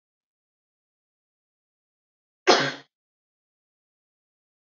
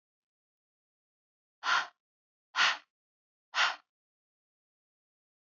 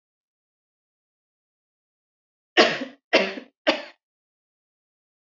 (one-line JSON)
{"cough_length": "4.6 s", "cough_amplitude": 26833, "cough_signal_mean_std_ratio": 0.16, "exhalation_length": "5.5 s", "exhalation_amplitude": 6956, "exhalation_signal_mean_std_ratio": 0.25, "three_cough_length": "5.3 s", "three_cough_amplitude": 26500, "three_cough_signal_mean_std_ratio": 0.23, "survey_phase": "beta (2021-08-13 to 2022-03-07)", "age": "18-44", "gender": "Female", "wearing_mask": "No", "symptom_none": true, "smoker_status": "Never smoked", "respiratory_condition_asthma": false, "respiratory_condition_other": false, "recruitment_source": "Test and Trace", "submission_delay": "1 day", "covid_test_result": "Negative", "covid_test_method": "RT-qPCR"}